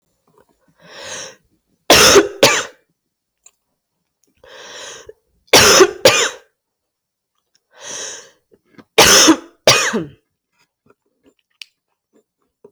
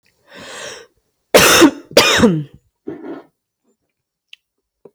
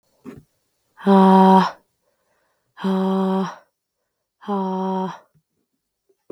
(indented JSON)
{
  "three_cough_length": "12.7 s",
  "three_cough_amplitude": 32768,
  "three_cough_signal_mean_std_ratio": 0.33,
  "cough_length": "4.9 s",
  "cough_amplitude": 32768,
  "cough_signal_mean_std_ratio": 0.36,
  "exhalation_length": "6.3 s",
  "exhalation_amplitude": 30928,
  "exhalation_signal_mean_std_ratio": 0.44,
  "survey_phase": "beta (2021-08-13 to 2022-03-07)",
  "age": "18-44",
  "gender": "Female",
  "wearing_mask": "No",
  "symptom_cough_any": true,
  "symptom_new_continuous_cough": true,
  "symptom_runny_or_blocked_nose": true,
  "symptom_change_to_sense_of_smell_or_taste": true,
  "symptom_loss_of_taste": true,
  "symptom_onset": "7 days",
  "smoker_status": "Never smoked",
  "respiratory_condition_asthma": false,
  "respiratory_condition_other": false,
  "recruitment_source": "REACT",
  "submission_delay": "3 days",
  "covid_test_result": "Positive",
  "covid_test_method": "RT-qPCR",
  "covid_ct_value": 23.3,
  "covid_ct_gene": "N gene",
  "influenza_a_test_result": "Negative",
  "influenza_b_test_result": "Negative"
}